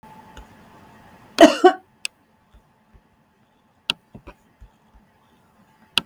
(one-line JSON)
{"cough_length": "6.1 s", "cough_amplitude": 32768, "cough_signal_mean_std_ratio": 0.18, "survey_phase": "beta (2021-08-13 to 2022-03-07)", "age": "45-64", "gender": "Female", "wearing_mask": "No", "symptom_none": true, "smoker_status": "Never smoked", "respiratory_condition_asthma": false, "respiratory_condition_other": false, "recruitment_source": "REACT", "submission_delay": "7 days", "covid_test_result": "Negative", "covid_test_method": "RT-qPCR"}